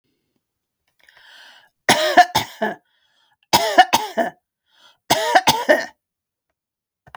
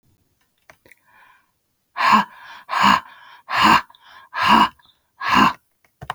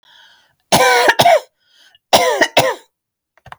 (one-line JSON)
{"three_cough_length": "7.2 s", "three_cough_amplitude": 32768, "three_cough_signal_mean_std_ratio": 0.35, "exhalation_length": "6.1 s", "exhalation_amplitude": 29332, "exhalation_signal_mean_std_ratio": 0.41, "cough_length": "3.6 s", "cough_amplitude": 32768, "cough_signal_mean_std_ratio": 0.48, "survey_phase": "beta (2021-08-13 to 2022-03-07)", "age": "45-64", "gender": "Female", "wearing_mask": "No", "symptom_runny_or_blocked_nose": true, "symptom_shortness_of_breath": true, "symptom_sore_throat": true, "symptom_fatigue": true, "symptom_headache": true, "symptom_onset": "12 days", "smoker_status": "Never smoked", "respiratory_condition_asthma": false, "respiratory_condition_other": false, "recruitment_source": "REACT", "submission_delay": "2 days", "covid_test_result": "Negative", "covid_test_method": "RT-qPCR"}